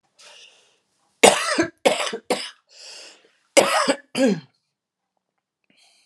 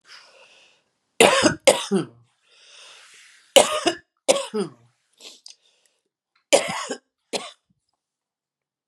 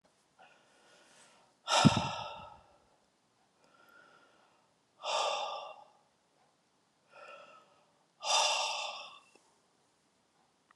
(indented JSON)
{
  "cough_length": "6.1 s",
  "cough_amplitude": 32768,
  "cough_signal_mean_std_ratio": 0.35,
  "three_cough_length": "8.9 s",
  "three_cough_amplitude": 32768,
  "three_cough_signal_mean_std_ratio": 0.29,
  "exhalation_length": "10.8 s",
  "exhalation_amplitude": 11203,
  "exhalation_signal_mean_std_ratio": 0.32,
  "survey_phase": "alpha (2021-03-01 to 2021-08-12)",
  "age": "45-64",
  "gender": "Female",
  "wearing_mask": "No",
  "symptom_cough_any": true,
  "symptom_diarrhoea": true,
  "symptom_fatigue": true,
  "symptom_headache": true,
  "smoker_status": "Current smoker (e-cigarettes or vapes only)",
  "respiratory_condition_asthma": false,
  "respiratory_condition_other": false,
  "recruitment_source": "Test and Trace",
  "submission_delay": "1 day",
  "covid_test_result": "Positive",
  "covid_test_method": "LFT"
}